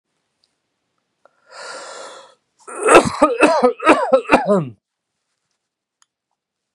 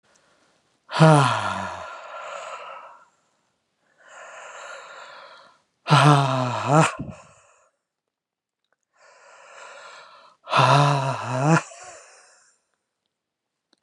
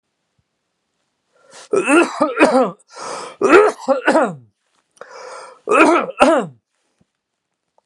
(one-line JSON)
{"cough_length": "6.7 s", "cough_amplitude": 32768, "cough_signal_mean_std_ratio": 0.37, "exhalation_length": "13.8 s", "exhalation_amplitude": 29790, "exhalation_signal_mean_std_ratio": 0.37, "three_cough_length": "7.9 s", "three_cough_amplitude": 32768, "three_cough_signal_mean_std_ratio": 0.44, "survey_phase": "beta (2021-08-13 to 2022-03-07)", "age": "45-64", "gender": "Male", "wearing_mask": "No", "symptom_cough_any": true, "symptom_runny_or_blocked_nose": true, "symptom_fatigue": true, "symptom_onset": "6 days", "smoker_status": "Ex-smoker", "respiratory_condition_asthma": false, "respiratory_condition_other": false, "recruitment_source": "Test and Trace", "submission_delay": "2 days", "covid_test_result": "Positive", "covid_test_method": "RT-qPCR", "covid_ct_value": 13.4, "covid_ct_gene": "ORF1ab gene"}